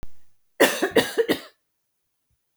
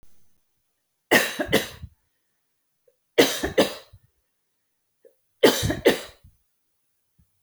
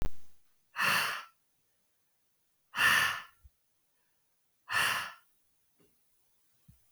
cough_length: 2.6 s
cough_amplitude: 23568
cough_signal_mean_std_ratio: 0.4
three_cough_length: 7.4 s
three_cough_amplitude: 30556
three_cough_signal_mean_std_ratio: 0.3
exhalation_length: 6.9 s
exhalation_amplitude: 6889
exhalation_signal_mean_std_ratio: 0.39
survey_phase: beta (2021-08-13 to 2022-03-07)
age: 45-64
gender: Female
wearing_mask: 'No'
symptom_cough_any: true
symptom_sore_throat: true
symptom_fatigue: true
symptom_headache: true
symptom_onset: 3 days
smoker_status: Ex-smoker
respiratory_condition_asthma: false
respiratory_condition_other: false
recruitment_source: REACT
submission_delay: 1 day
covid_test_result: Negative
covid_test_method: RT-qPCR
influenza_a_test_result: Negative
influenza_b_test_result: Negative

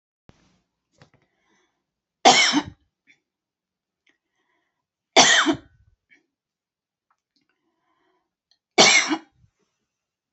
three_cough_length: 10.3 s
three_cough_amplitude: 29416
three_cough_signal_mean_std_ratio: 0.25
survey_phase: beta (2021-08-13 to 2022-03-07)
age: 45-64
gender: Female
wearing_mask: 'No'
symptom_none: true
smoker_status: Never smoked
respiratory_condition_asthma: false
respiratory_condition_other: false
recruitment_source: REACT
submission_delay: 9 days
covid_test_result: Negative
covid_test_method: RT-qPCR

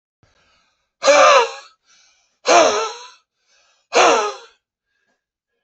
exhalation_length: 5.6 s
exhalation_amplitude: 29996
exhalation_signal_mean_std_ratio: 0.39
survey_phase: beta (2021-08-13 to 2022-03-07)
age: 45-64
gender: Male
wearing_mask: 'No'
symptom_cough_any: true
symptom_runny_or_blocked_nose: true
symptom_shortness_of_breath: true
symptom_abdominal_pain: true
symptom_diarrhoea: true
symptom_fatigue: true
symptom_headache: true
symptom_other: true
smoker_status: Ex-smoker
respiratory_condition_asthma: false
respiratory_condition_other: true
recruitment_source: Test and Trace
submission_delay: 1 day
covid_test_result: Positive
covid_test_method: LFT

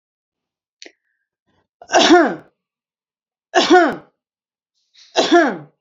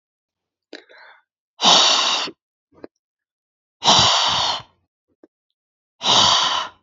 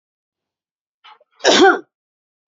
three_cough_length: 5.8 s
three_cough_amplitude: 29035
three_cough_signal_mean_std_ratio: 0.36
exhalation_length: 6.8 s
exhalation_amplitude: 32768
exhalation_signal_mean_std_ratio: 0.45
cough_length: 2.5 s
cough_amplitude: 30869
cough_signal_mean_std_ratio: 0.3
survey_phase: beta (2021-08-13 to 2022-03-07)
age: 45-64
gender: Female
wearing_mask: 'No'
symptom_none: true
smoker_status: Ex-smoker
respiratory_condition_asthma: false
respiratory_condition_other: false
recruitment_source: REACT
submission_delay: 1 day
covid_test_result: Negative
covid_test_method: RT-qPCR
influenza_a_test_result: Negative
influenza_b_test_result: Negative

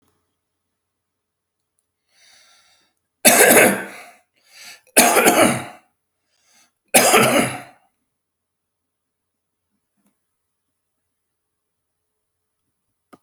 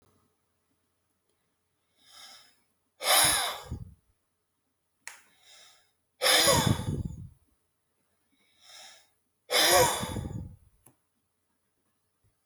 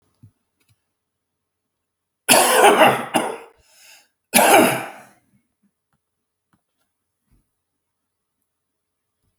three_cough_length: 13.2 s
three_cough_amplitude: 32768
three_cough_signal_mean_std_ratio: 0.29
exhalation_length: 12.5 s
exhalation_amplitude: 12652
exhalation_signal_mean_std_ratio: 0.33
cough_length: 9.4 s
cough_amplitude: 32768
cough_signal_mean_std_ratio: 0.3
survey_phase: beta (2021-08-13 to 2022-03-07)
age: 65+
gender: Male
wearing_mask: 'No'
symptom_none: true
smoker_status: Never smoked
respiratory_condition_asthma: false
respiratory_condition_other: false
recruitment_source: REACT
submission_delay: 2 days
covid_test_result: Negative
covid_test_method: RT-qPCR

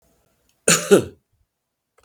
cough_length: 2.0 s
cough_amplitude: 32767
cough_signal_mean_std_ratio: 0.28
survey_phase: beta (2021-08-13 to 2022-03-07)
age: 65+
gender: Male
wearing_mask: 'No'
symptom_cough_any: true
symptom_runny_or_blocked_nose: true
symptom_onset: 12 days
smoker_status: Ex-smoker
respiratory_condition_asthma: false
respiratory_condition_other: false
recruitment_source: REACT
submission_delay: 1 day
covid_test_result: Negative
covid_test_method: RT-qPCR
influenza_a_test_result: Negative
influenza_b_test_result: Negative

